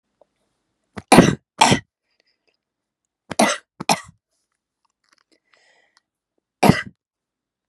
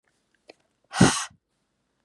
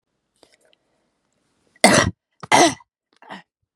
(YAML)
three_cough_length: 7.7 s
three_cough_amplitude: 32768
three_cough_signal_mean_std_ratio: 0.23
exhalation_length: 2.0 s
exhalation_amplitude: 20819
exhalation_signal_mean_std_ratio: 0.25
cough_length: 3.8 s
cough_amplitude: 32768
cough_signal_mean_std_ratio: 0.28
survey_phase: beta (2021-08-13 to 2022-03-07)
age: 18-44
gender: Female
wearing_mask: 'No'
symptom_other: true
symptom_onset: 2 days
smoker_status: Never smoked
respiratory_condition_asthma: false
respiratory_condition_other: false
recruitment_source: Test and Trace
submission_delay: 1 day
covid_test_result: Positive
covid_test_method: RT-qPCR
covid_ct_value: 17.7
covid_ct_gene: ORF1ab gene
covid_ct_mean: 18.1
covid_viral_load: 1200000 copies/ml
covid_viral_load_category: High viral load (>1M copies/ml)